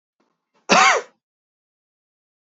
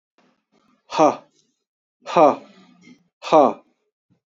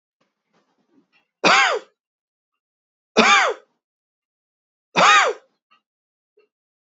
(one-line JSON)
{"cough_length": "2.6 s", "cough_amplitude": 31830, "cough_signal_mean_std_ratio": 0.28, "exhalation_length": "4.3 s", "exhalation_amplitude": 28817, "exhalation_signal_mean_std_ratio": 0.3, "three_cough_length": "6.8 s", "three_cough_amplitude": 29092, "three_cough_signal_mean_std_ratio": 0.32, "survey_phase": "beta (2021-08-13 to 2022-03-07)", "age": "45-64", "gender": "Male", "wearing_mask": "No", "symptom_runny_or_blocked_nose": true, "symptom_headache": true, "smoker_status": "Never smoked", "respiratory_condition_asthma": true, "respiratory_condition_other": false, "recruitment_source": "Test and Trace", "submission_delay": "1 day", "covid_test_result": "Positive", "covid_test_method": "RT-qPCR", "covid_ct_value": 20.9, "covid_ct_gene": "ORF1ab gene", "covid_ct_mean": 21.5, "covid_viral_load": "91000 copies/ml", "covid_viral_load_category": "Low viral load (10K-1M copies/ml)"}